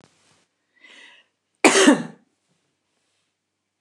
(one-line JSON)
{"cough_length": "3.8 s", "cough_amplitude": 29203, "cough_signal_mean_std_ratio": 0.24, "survey_phase": "beta (2021-08-13 to 2022-03-07)", "age": "65+", "gender": "Female", "wearing_mask": "No", "symptom_none": true, "smoker_status": "Ex-smoker", "respiratory_condition_asthma": false, "respiratory_condition_other": false, "recruitment_source": "REACT", "submission_delay": "1 day", "covid_test_result": "Negative", "covid_test_method": "RT-qPCR"}